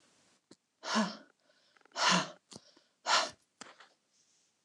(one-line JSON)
{"exhalation_length": "4.6 s", "exhalation_amplitude": 5671, "exhalation_signal_mean_std_ratio": 0.34, "survey_phase": "beta (2021-08-13 to 2022-03-07)", "age": "65+", "gender": "Female", "wearing_mask": "No", "symptom_none": true, "smoker_status": "Never smoked", "respiratory_condition_asthma": false, "respiratory_condition_other": false, "recruitment_source": "REACT", "submission_delay": "2 days", "covid_test_result": "Negative", "covid_test_method": "RT-qPCR", "influenza_a_test_result": "Negative", "influenza_b_test_result": "Negative"}